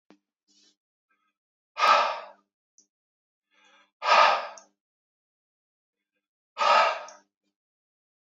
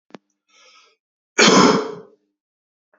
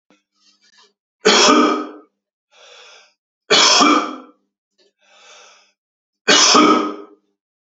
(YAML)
exhalation_length: 8.3 s
exhalation_amplitude: 16067
exhalation_signal_mean_std_ratio: 0.3
cough_length: 3.0 s
cough_amplitude: 32767
cough_signal_mean_std_ratio: 0.33
three_cough_length: 7.7 s
three_cough_amplitude: 32768
three_cough_signal_mean_std_ratio: 0.41
survey_phase: beta (2021-08-13 to 2022-03-07)
age: 18-44
gender: Male
wearing_mask: 'No'
symptom_cough_any: true
symptom_runny_or_blocked_nose: true
symptom_fatigue: true
symptom_fever_high_temperature: true
symptom_headache: true
smoker_status: Never smoked
respiratory_condition_asthma: false
respiratory_condition_other: false
recruitment_source: Test and Trace
submission_delay: 1 day
covid_test_result: Positive
covid_test_method: LFT